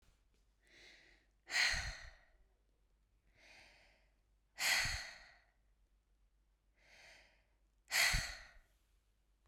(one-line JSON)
{"exhalation_length": "9.5 s", "exhalation_amplitude": 3242, "exhalation_signal_mean_std_ratio": 0.33, "survey_phase": "beta (2021-08-13 to 2022-03-07)", "age": "18-44", "gender": "Female", "wearing_mask": "No", "symptom_cough_any": true, "symptom_sore_throat": true, "symptom_fatigue": true, "symptom_onset": "23 days", "smoker_status": "Never smoked", "respiratory_condition_asthma": true, "respiratory_condition_other": false, "recruitment_source": "Test and Trace", "submission_delay": "2 days", "covid_test_result": "Negative", "covid_test_method": "RT-qPCR"}